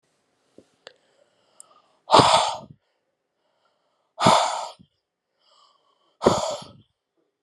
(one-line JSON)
{"exhalation_length": "7.4 s", "exhalation_amplitude": 30890, "exhalation_signal_mean_std_ratio": 0.29, "survey_phase": "beta (2021-08-13 to 2022-03-07)", "age": "18-44", "gender": "Female", "wearing_mask": "No", "symptom_cough_any": true, "symptom_runny_or_blocked_nose": true, "symptom_sore_throat": true, "symptom_abdominal_pain": true, "symptom_diarrhoea": true, "symptom_fatigue": true, "symptom_fever_high_temperature": true, "symptom_loss_of_taste": true, "symptom_onset": "6 days", "smoker_status": "Ex-smoker", "respiratory_condition_asthma": false, "respiratory_condition_other": false, "recruitment_source": "Test and Trace", "submission_delay": "1 day", "covid_test_result": "Positive", "covid_test_method": "RT-qPCR", "covid_ct_value": 16.2, "covid_ct_gene": "N gene", "covid_ct_mean": 16.5, "covid_viral_load": "3900000 copies/ml", "covid_viral_load_category": "High viral load (>1M copies/ml)"}